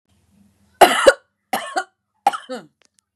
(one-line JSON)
{"three_cough_length": "3.2 s", "three_cough_amplitude": 32768, "three_cough_signal_mean_std_ratio": 0.29, "survey_phase": "beta (2021-08-13 to 2022-03-07)", "age": "45-64", "gender": "Female", "wearing_mask": "No", "symptom_none": true, "smoker_status": "Ex-smoker", "respiratory_condition_asthma": false, "respiratory_condition_other": false, "recruitment_source": "REACT", "submission_delay": "2 days", "covid_test_result": "Negative", "covid_test_method": "RT-qPCR", "influenza_a_test_result": "Negative", "influenza_b_test_result": "Negative"}